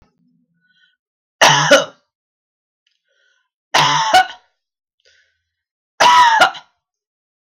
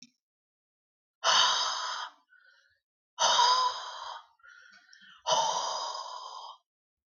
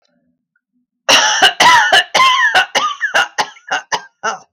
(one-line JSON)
{"three_cough_length": "7.5 s", "three_cough_amplitude": 32768, "three_cough_signal_mean_std_ratio": 0.36, "exhalation_length": "7.2 s", "exhalation_amplitude": 10794, "exhalation_signal_mean_std_ratio": 0.47, "cough_length": "4.5 s", "cough_amplitude": 32768, "cough_signal_mean_std_ratio": 0.6, "survey_phase": "beta (2021-08-13 to 2022-03-07)", "age": "18-44", "gender": "Female", "wearing_mask": "No", "symptom_cough_any": true, "symptom_sore_throat": true, "symptom_change_to_sense_of_smell_or_taste": true, "symptom_onset": "3 days", "smoker_status": "Ex-smoker", "respiratory_condition_asthma": false, "respiratory_condition_other": false, "recruitment_source": "Test and Trace", "submission_delay": "1 day", "covid_test_result": "Positive", "covid_test_method": "RT-qPCR", "covid_ct_value": 15.7, "covid_ct_gene": "ORF1ab gene", "covid_ct_mean": 16.0, "covid_viral_load": "5500000 copies/ml", "covid_viral_load_category": "High viral load (>1M copies/ml)"}